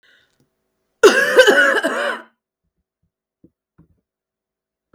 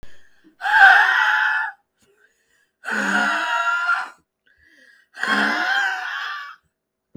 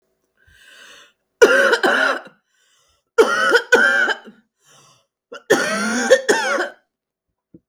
{"cough_length": "4.9 s", "cough_amplitude": 32768, "cough_signal_mean_std_ratio": 0.34, "exhalation_length": "7.2 s", "exhalation_amplitude": 32766, "exhalation_signal_mean_std_ratio": 0.56, "three_cough_length": "7.7 s", "three_cough_amplitude": 32766, "three_cough_signal_mean_std_ratio": 0.47, "survey_phase": "beta (2021-08-13 to 2022-03-07)", "age": "45-64", "gender": "Female", "wearing_mask": "No", "symptom_sore_throat": true, "symptom_diarrhoea": true, "symptom_fatigue": true, "symptom_headache": true, "symptom_change_to_sense_of_smell_or_taste": true, "symptom_other": true, "smoker_status": "Ex-smoker", "respiratory_condition_asthma": false, "respiratory_condition_other": false, "recruitment_source": "Test and Trace", "submission_delay": "2 days", "covid_test_result": "Positive", "covid_test_method": "RT-qPCR", "covid_ct_value": 18.8, "covid_ct_gene": "ORF1ab gene", "covid_ct_mean": 19.4, "covid_viral_load": "450000 copies/ml", "covid_viral_load_category": "Low viral load (10K-1M copies/ml)"}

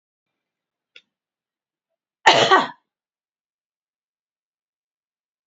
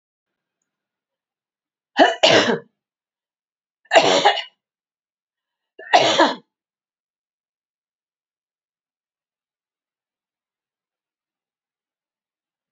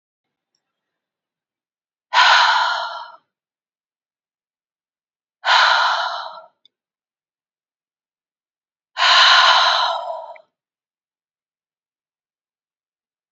{"cough_length": "5.5 s", "cough_amplitude": 28249, "cough_signal_mean_std_ratio": 0.2, "three_cough_length": "12.7 s", "three_cough_amplitude": 31521, "three_cough_signal_mean_std_ratio": 0.25, "exhalation_length": "13.3 s", "exhalation_amplitude": 30281, "exhalation_signal_mean_std_ratio": 0.35, "survey_phase": "beta (2021-08-13 to 2022-03-07)", "age": "65+", "gender": "Female", "wearing_mask": "No", "symptom_none": true, "smoker_status": "Never smoked", "respiratory_condition_asthma": false, "respiratory_condition_other": false, "recruitment_source": "Test and Trace", "submission_delay": "1 day", "covid_test_result": "Negative", "covid_test_method": "RT-qPCR"}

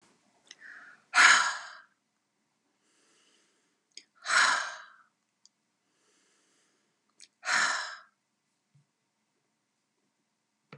{"exhalation_length": "10.8 s", "exhalation_amplitude": 16379, "exhalation_signal_mean_std_ratio": 0.26, "survey_phase": "beta (2021-08-13 to 2022-03-07)", "age": "65+", "gender": "Female", "wearing_mask": "No", "symptom_none": true, "smoker_status": "Never smoked", "respiratory_condition_asthma": false, "respiratory_condition_other": false, "recruitment_source": "REACT", "submission_delay": "2 days", "covid_test_result": "Negative", "covid_test_method": "RT-qPCR"}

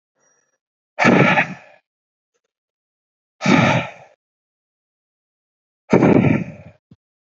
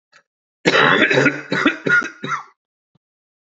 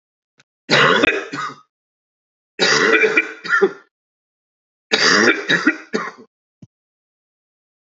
{"exhalation_length": "7.3 s", "exhalation_amplitude": 27172, "exhalation_signal_mean_std_ratio": 0.36, "cough_length": "3.5 s", "cough_amplitude": 32423, "cough_signal_mean_std_ratio": 0.5, "three_cough_length": "7.9 s", "three_cough_amplitude": 30415, "three_cough_signal_mean_std_ratio": 0.45, "survey_phase": "beta (2021-08-13 to 2022-03-07)", "age": "18-44", "gender": "Male", "wearing_mask": "No", "symptom_cough_any": true, "symptom_fatigue": true, "symptom_fever_high_temperature": true, "symptom_headache": true, "smoker_status": "Prefer not to say", "respiratory_condition_asthma": false, "respiratory_condition_other": false, "recruitment_source": "Test and Trace", "submission_delay": "2 days", "covid_test_result": "Positive", "covid_test_method": "LFT"}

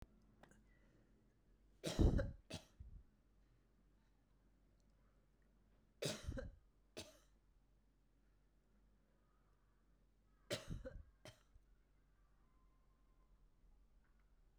{"three_cough_length": "14.6 s", "three_cough_amplitude": 2451, "three_cough_signal_mean_std_ratio": 0.25, "survey_phase": "beta (2021-08-13 to 2022-03-07)", "age": "45-64", "gender": "Female", "wearing_mask": "No", "symptom_none": true, "smoker_status": "Ex-smoker", "respiratory_condition_asthma": false, "respiratory_condition_other": false, "recruitment_source": "REACT", "submission_delay": "2 days", "covid_test_result": "Negative", "covid_test_method": "RT-qPCR"}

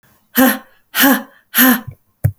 {"exhalation_length": "2.4 s", "exhalation_amplitude": 32768, "exhalation_signal_mean_std_ratio": 0.49, "survey_phase": "beta (2021-08-13 to 2022-03-07)", "age": "45-64", "gender": "Female", "wearing_mask": "No", "symptom_none": true, "smoker_status": "Ex-smoker", "respiratory_condition_asthma": false, "respiratory_condition_other": false, "recruitment_source": "REACT", "submission_delay": "4 days", "covid_test_result": "Negative", "covid_test_method": "RT-qPCR"}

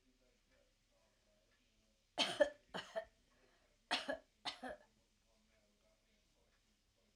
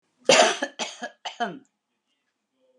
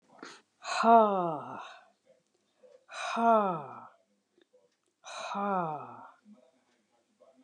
{"three_cough_length": "7.2 s", "three_cough_amplitude": 2838, "three_cough_signal_mean_std_ratio": 0.25, "cough_length": "2.8 s", "cough_amplitude": 22627, "cough_signal_mean_std_ratio": 0.33, "exhalation_length": "7.4 s", "exhalation_amplitude": 11170, "exhalation_signal_mean_std_ratio": 0.36, "survey_phase": "alpha (2021-03-01 to 2021-08-12)", "age": "65+", "gender": "Female", "wearing_mask": "No", "symptom_none": true, "smoker_status": "Ex-smoker", "respiratory_condition_asthma": false, "respiratory_condition_other": false, "recruitment_source": "REACT", "submission_delay": "1 day", "covid_test_result": "Negative", "covid_test_method": "RT-qPCR"}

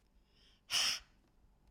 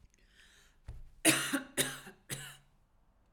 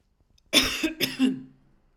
{"exhalation_length": "1.7 s", "exhalation_amplitude": 3239, "exhalation_signal_mean_std_ratio": 0.36, "three_cough_length": "3.3 s", "three_cough_amplitude": 8740, "three_cough_signal_mean_std_ratio": 0.36, "cough_length": "2.0 s", "cough_amplitude": 18579, "cough_signal_mean_std_ratio": 0.47, "survey_phase": "alpha (2021-03-01 to 2021-08-12)", "age": "45-64", "gender": "Female", "wearing_mask": "No", "symptom_none": true, "smoker_status": "Ex-smoker", "respiratory_condition_asthma": false, "respiratory_condition_other": false, "recruitment_source": "REACT", "submission_delay": "1 day", "covid_test_result": "Negative", "covid_test_method": "RT-qPCR"}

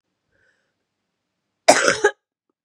{"cough_length": "2.6 s", "cough_amplitude": 32768, "cough_signal_mean_std_ratio": 0.26, "survey_phase": "beta (2021-08-13 to 2022-03-07)", "age": "18-44", "gender": "Female", "wearing_mask": "No", "symptom_cough_any": true, "symptom_new_continuous_cough": true, "symptom_runny_or_blocked_nose": true, "symptom_abdominal_pain": true, "symptom_fatigue": true, "symptom_fever_high_temperature": true, "symptom_headache": true, "symptom_change_to_sense_of_smell_or_taste": true, "symptom_loss_of_taste": true, "symptom_onset": "4 days", "smoker_status": "Current smoker (e-cigarettes or vapes only)", "respiratory_condition_asthma": false, "respiratory_condition_other": false, "recruitment_source": "Test and Trace", "submission_delay": "1 day", "covid_test_result": "Positive", "covid_test_method": "RT-qPCR", "covid_ct_value": 16.7, "covid_ct_gene": "S gene", "covid_ct_mean": 17.1, "covid_viral_load": "2400000 copies/ml", "covid_viral_load_category": "High viral load (>1M copies/ml)"}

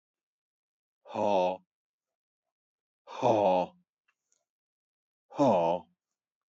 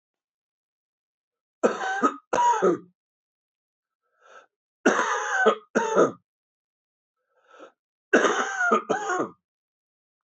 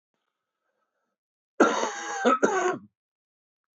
{"exhalation_length": "6.5 s", "exhalation_amplitude": 8049, "exhalation_signal_mean_std_ratio": 0.36, "three_cough_length": "10.2 s", "three_cough_amplitude": 18907, "three_cough_signal_mean_std_ratio": 0.42, "cough_length": "3.8 s", "cough_amplitude": 16300, "cough_signal_mean_std_ratio": 0.39, "survey_phase": "beta (2021-08-13 to 2022-03-07)", "age": "45-64", "gender": "Male", "wearing_mask": "No", "symptom_fatigue": true, "symptom_other": true, "symptom_onset": "3 days", "smoker_status": "Never smoked", "respiratory_condition_asthma": false, "respiratory_condition_other": false, "recruitment_source": "Test and Trace", "submission_delay": "2 days", "covid_test_result": "Negative", "covid_test_method": "RT-qPCR"}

